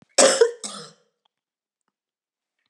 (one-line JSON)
{"cough_length": "2.7 s", "cough_amplitude": 31392, "cough_signal_mean_std_ratio": 0.28, "survey_phase": "beta (2021-08-13 to 2022-03-07)", "age": "45-64", "gender": "Female", "wearing_mask": "No", "symptom_cough_any": true, "symptom_runny_or_blocked_nose": true, "symptom_onset": "7 days", "smoker_status": "Ex-smoker", "respiratory_condition_asthma": false, "respiratory_condition_other": false, "recruitment_source": "Test and Trace", "submission_delay": "2 days", "covid_test_result": "Positive", "covid_test_method": "RT-qPCR", "covid_ct_value": 11.0, "covid_ct_gene": "ORF1ab gene", "covid_ct_mean": 11.1, "covid_viral_load": "220000000 copies/ml", "covid_viral_load_category": "High viral load (>1M copies/ml)"}